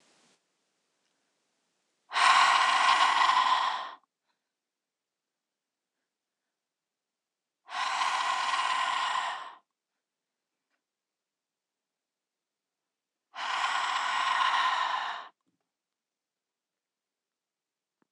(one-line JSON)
{"exhalation_length": "18.1 s", "exhalation_amplitude": 12232, "exhalation_signal_mean_std_ratio": 0.43, "survey_phase": "alpha (2021-03-01 to 2021-08-12)", "age": "45-64", "gender": "Female", "wearing_mask": "No", "symptom_none": true, "smoker_status": "Ex-smoker", "respiratory_condition_asthma": false, "respiratory_condition_other": false, "recruitment_source": "REACT", "submission_delay": "2 days", "covid_test_result": "Negative", "covid_test_method": "RT-qPCR"}